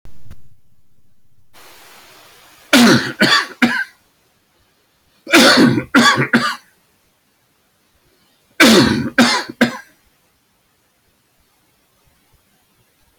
{"three_cough_length": "13.2 s", "three_cough_amplitude": 31476, "three_cough_signal_mean_std_ratio": 0.4, "survey_phase": "beta (2021-08-13 to 2022-03-07)", "age": "65+", "gender": "Male", "wearing_mask": "No", "symptom_none": true, "smoker_status": "Ex-smoker", "respiratory_condition_asthma": false, "respiratory_condition_other": false, "recruitment_source": "REACT", "submission_delay": "2 days", "covid_test_result": "Negative", "covid_test_method": "RT-qPCR"}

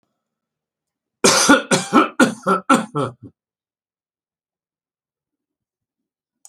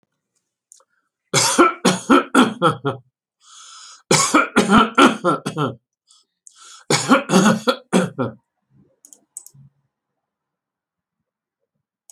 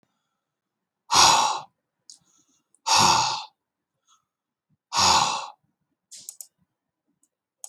{"cough_length": "6.5 s", "cough_amplitude": 32768, "cough_signal_mean_std_ratio": 0.33, "three_cough_length": "12.1 s", "three_cough_amplitude": 32443, "three_cough_signal_mean_std_ratio": 0.41, "exhalation_length": "7.7 s", "exhalation_amplitude": 24338, "exhalation_signal_mean_std_ratio": 0.35, "survey_phase": "beta (2021-08-13 to 2022-03-07)", "age": "65+", "gender": "Male", "wearing_mask": "No", "symptom_none": true, "smoker_status": "Never smoked", "respiratory_condition_asthma": false, "respiratory_condition_other": false, "recruitment_source": "REACT", "submission_delay": "3 days", "covid_test_result": "Negative", "covid_test_method": "RT-qPCR"}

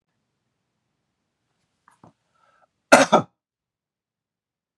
{"cough_length": "4.8 s", "cough_amplitude": 32768, "cough_signal_mean_std_ratio": 0.16, "survey_phase": "beta (2021-08-13 to 2022-03-07)", "age": "45-64", "gender": "Male", "wearing_mask": "No", "symptom_none": true, "smoker_status": "Never smoked", "respiratory_condition_asthma": false, "respiratory_condition_other": false, "recruitment_source": "REACT", "submission_delay": "1 day", "covid_test_result": "Negative", "covid_test_method": "RT-qPCR", "influenza_a_test_result": "Negative", "influenza_b_test_result": "Negative"}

